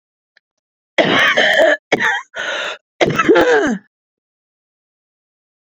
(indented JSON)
{
  "cough_length": "5.6 s",
  "cough_amplitude": 32204,
  "cough_signal_mean_std_ratio": 0.51,
  "survey_phase": "beta (2021-08-13 to 2022-03-07)",
  "age": "45-64",
  "gender": "Female",
  "wearing_mask": "No",
  "symptom_cough_any": true,
  "symptom_abdominal_pain": true,
  "symptom_diarrhoea": true,
  "symptom_onset": "10 days",
  "smoker_status": "Ex-smoker",
  "respiratory_condition_asthma": true,
  "respiratory_condition_other": true,
  "recruitment_source": "Test and Trace",
  "submission_delay": "1 day",
  "covid_test_result": "Positive",
  "covid_test_method": "RT-qPCR",
  "covid_ct_value": 19.5,
  "covid_ct_gene": "ORF1ab gene",
  "covid_ct_mean": 20.0,
  "covid_viral_load": "280000 copies/ml",
  "covid_viral_load_category": "Low viral load (10K-1M copies/ml)"
}